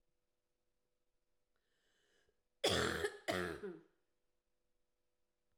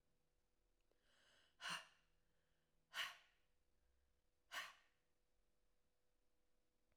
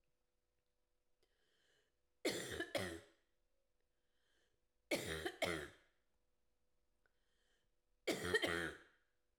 {"cough_length": "5.6 s", "cough_amplitude": 2679, "cough_signal_mean_std_ratio": 0.31, "exhalation_length": "7.0 s", "exhalation_amplitude": 560, "exhalation_signal_mean_std_ratio": 0.29, "three_cough_length": "9.4 s", "three_cough_amplitude": 2115, "three_cough_signal_mean_std_ratio": 0.35, "survey_phase": "beta (2021-08-13 to 2022-03-07)", "age": "45-64", "gender": "Female", "wearing_mask": "No", "symptom_cough_any": true, "symptom_runny_or_blocked_nose": true, "symptom_change_to_sense_of_smell_or_taste": true, "symptom_onset": "4 days", "smoker_status": "Ex-smoker", "respiratory_condition_asthma": true, "respiratory_condition_other": false, "recruitment_source": "Test and Trace", "submission_delay": "2 days", "covid_test_result": "Positive", "covid_test_method": "LAMP"}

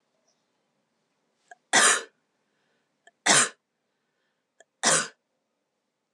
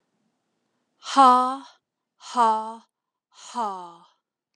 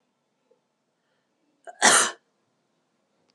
{"three_cough_length": "6.1 s", "three_cough_amplitude": 17633, "three_cough_signal_mean_std_ratio": 0.27, "exhalation_length": "4.6 s", "exhalation_amplitude": 19608, "exhalation_signal_mean_std_ratio": 0.34, "cough_length": "3.3 s", "cough_amplitude": 22925, "cough_signal_mean_std_ratio": 0.23, "survey_phase": "alpha (2021-03-01 to 2021-08-12)", "age": "18-44", "gender": "Female", "wearing_mask": "No", "symptom_abdominal_pain": true, "symptom_onset": "13 days", "smoker_status": "Never smoked", "respiratory_condition_asthma": true, "respiratory_condition_other": false, "recruitment_source": "REACT", "submission_delay": "2 days", "covid_test_result": "Negative", "covid_test_method": "RT-qPCR"}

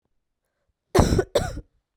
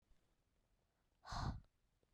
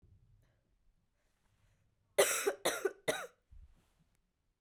{"cough_length": "2.0 s", "cough_amplitude": 31955, "cough_signal_mean_std_ratio": 0.37, "exhalation_length": "2.1 s", "exhalation_amplitude": 738, "exhalation_signal_mean_std_ratio": 0.34, "three_cough_length": "4.6 s", "three_cough_amplitude": 6074, "three_cough_signal_mean_std_ratio": 0.29, "survey_phase": "beta (2021-08-13 to 2022-03-07)", "age": "18-44", "gender": "Female", "wearing_mask": "No", "symptom_cough_any": true, "symptom_new_continuous_cough": true, "symptom_runny_or_blocked_nose": true, "symptom_shortness_of_breath": true, "symptom_sore_throat": true, "symptom_fatigue": true, "symptom_onset": "3 days", "smoker_status": "Never smoked", "respiratory_condition_asthma": false, "respiratory_condition_other": false, "recruitment_source": "REACT", "submission_delay": "1 day", "covid_test_result": "Negative", "covid_test_method": "RT-qPCR", "influenza_a_test_result": "Unknown/Void", "influenza_b_test_result": "Unknown/Void"}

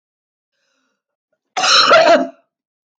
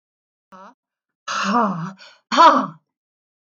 {"cough_length": "3.0 s", "cough_amplitude": 28308, "cough_signal_mean_std_ratio": 0.41, "exhalation_length": "3.6 s", "exhalation_amplitude": 24702, "exhalation_signal_mean_std_ratio": 0.37, "survey_phase": "alpha (2021-03-01 to 2021-08-12)", "age": "65+", "gender": "Female", "wearing_mask": "No", "symptom_none": true, "smoker_status": "Never smoked", "respiratory_condition_asthma": false, "respiratory_condition_other": false, "recruitment_source": "REACT", "submission_delay": "2 days", "covid_test_result": "Negative", "covid_test_method": "RT-qPCR"}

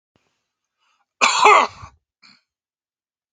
{"cough_length": "3.3 s", "cough_amplitude": 32768, "cough_signal_mean_std_ratio": 0.29, "survey_phase": "beta (2021-08-13 to 2022-03-07)", "age": "45-64", "gender": "Male", "wearing_mask": "No", "symptom_none": true, "smoker_status": "Never smoked", "respiratory_condition_asthma": false, "respiratory_condition_other": false, "recruitment_source": "REACT", "submission_delay": "2 days", "covid_test_result": "Negative", "covid_test_method": "RT-qPCR", "influenza_a_test_result": "Negative", "influenza_b_test_result": "Negative"}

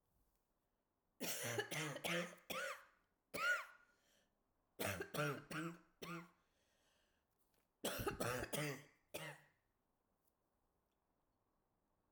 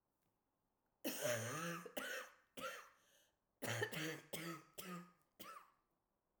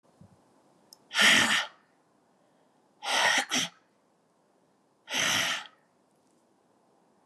{"three_cough_length": "12.1 s", "three_cough_amplitude": 1510, "three_cough_signal_mean_std_ratio": 0.46, "cough_length": "6.4 s", "cough_amplitude": 1281, "cough_signal_mean_std_ratio": 0.54, "exhalation_length": "7.3 s", "exhalation_amplitude": 12260, "exhalation_signal_mean_std_ratio": 0.37, "survey_phase": "alpha (2021-03-01 to 2021-08-12)", "age": "65+", "gender": "Female", "wearing_mask": "No", "symptom_new_continuous_cough": true, "symptom_abdominal_pain": true, "symptom_fatigue": true, "symptom_headache": true, "symptom_onset": "5 days", "smoker_status": "Never smoked", "respiratory_condition_asthma": false, "respiratory_condition_other": false, "recruitment_source": "Test and Trace", "submission_delay": "2 days", "covid_test_result": "Positive", "covid_test_method": "RT-qPCR"}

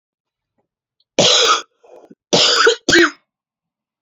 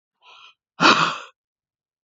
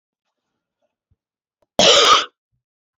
{"three_cough_length": "4.0 s", "three_cough_amplitude": 31736, "three_cough_signal_mean_std_ratio": 0.44, "exhalation_length": "2.0 s", "exhalation_amplitude": 29217, "exhalation_signal_mean_std_ratio": 0.31, "cough_length": "3.0 s", "cough_amplitude": 29619, "cough_signal_mean_std_ratio": 0.31, "survey_phase": "beta (2021-08-13 to 2022-03-07)", "age": "18-44", "gender": "Female", "wearing_mask": "No", "symptom_cough_any": true, "symptom_runny_or_blocked_nose": true, "symptom_shortness_of_breath": true, "symptom_sore_throat": true, "symptom_abdominal_pain": true, "symptom_fatigue": true, "symptom_fever_high_temperature": true, "symptom_headache": true, "symptom_onset": "3 days", "smoker_status": "Ex-smoker", "respiratory_condition_asthma": false, "respiratory_condition_other": false, "recruitment_source": "REACT", "submission_delay": "1 day", "covid_test_result": "Negative", "covid_test_method": "RT-qPCR"}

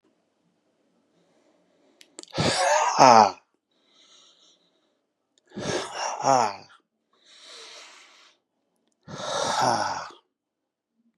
{"exhalation_length": "11.2 s", "exhalation_amplitude": 32372, "exhalation_signal_mean_std_ratio": 0.32, "survey_phase": "beta (2021-08-13 to 2022-03-07)", "age": "45-64", "gender": "Male", "wearing_mask": "No", "symptom_none": true, "smoker_status": "Never smoked", "respiratory_condition_asthma": false, "respiratory_condition_other": false, "recruitment_source": "REACT", "submission_delay": "2 days", "covid_test_result": "Negative", "covid_test_method": "RT-qPCR", "influenza_a_test_result": "Negative", "influenza_b_test_result": "Negative"}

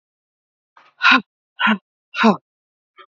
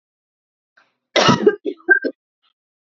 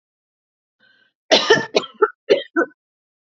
{"exhalation_length": "3.2 s", "exhalation_amplitude": 32768, "exhalation_signal_mean_std_ratio": 0.32, "cough_length": "2.8 s", "cough_amplitude": 29199, "cough_signal_mean_std_ratio": 0.34, "three_cough_length": "3.3 s", "three_cough_amplitude": 30216, "three_cough_signal_mean_std_ratio": 0.33, "survey_phase": "alpha (2021-03-01 to 2021-08-12)", "age": "18-44", "gender": "Female", "wearing_mask": "No", "symptom_none": true, "smoker_status": "Ex-smoker", "respiratory_condition_asthma": false, "respiratory_condition_other": false, "recruitment_source": "REACT", "submission_delay": "1 day", "covid_test_result": "Negative", "covid_test_method": "RT-qPCR"}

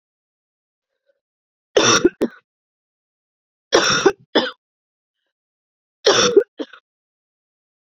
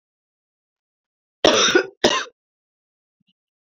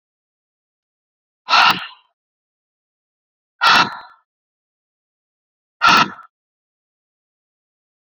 {"three_cough_length": "7.9 s", "three_cough_amplitude": 32767, "three_cough_signal_mean_std_ratio": 0.31, "cough_length": "3.7 s", "cough_amplitude": 28099, "cough_signal_mean_std_ratio": 0.3, "exhalation_length": "8.0 s", "exhalation_amplitude": 30141, "exhalation_signal_mean_std_ratio": 0.26, "survey_phase": "beta (2021-08-13 to 2022-03-07)", "age": "45-64", "gender": "Female", "wearing_mask": "No", "symptom_cough_any": true, "symptom_runny_or_blocked_nose": true, "symptom_shortness_of_breath": true, "symptom_fatigue": true, "symptom_change_to_sense_of_smell_or_taste": true, "symptom_loss_of_taste": true, "symptom_onset": "2 days", "smoker_status": "Never smoked", "respiratory_condition_asthma": false, "respiratory_condition_other": false, "recruitment_source": "Test and Trace", "submission_delay": "2 days", "covid_test_result": "Positive", "covid_test_method": "RT-qPCR", "covid_ct_value": 19.3, "covid_ct_gene": "ORF1ab gene"}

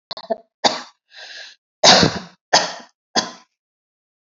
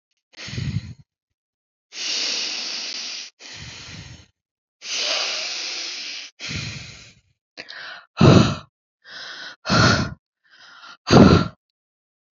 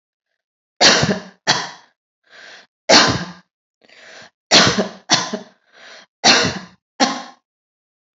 {"cough_length": "4.3 s", "cough_amplitude": 32634, "cough_signal_mean_std_ratio": 0.33, "exhalation_length": "12.4 s", "exhalation_amplitude": 30038, "exhalation_signal_mean_std_ratio": 0.38, "three_cough_length": "8.2 s", "three_cough_amplitude": 32768, "three_cough_signal_mean_std_ratio": 0.38, "survey_phase": "alpha (2021-03-01 to 2021-08-12)", "age": "45-64", "gender": "Female", "wearing_mask": "No", "symptom_none": true, "smoker_status": "Ex-smoker", "respiratory_condition_asthma": false, "respiratory_condition_other": false, "recruitment_source": "REACT", "submission_delay": "2 days", "covid_test_result": "Negative", "covid_test_method": "RT-qPCR"}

